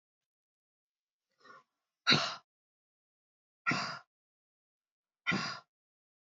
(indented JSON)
{
  "exhalation_length": "6.4 s",
  "exhalation_amplitude": 7973,
  "exhalation_signal_mean_std_ratio": 0.25,
  "survey_phase": "beta (2021-08-13 to 2022-03-07)",
  "age": "18-44",
  "gender": "Female",
  "wearing_mask": "No",
  "symptom_runny_or_blocked_nose": true,
  "symptom_fatigue": true,
  "symptom_change_to_sense_of_smell_or_taste": true,
  "symptom_loss_of_taste": true,
  "symptom_other": true,
  "symptom_onset": "3 days",
  "smoker_status": "Current smoker (1 to 10 cigarettes per day)",
  "respiratory_condition_asthma": false,
  "respiratory_condition_other": false,
  "recruitment_source": "Test and Trace",
  "submission_delay": "2 days",
  "covid_test_result": "Positive",
  "covid_test_method": "RT-qPCR",
  "covid_ct_value": 20.7,
  "covid_ct_gene": "N gene"
}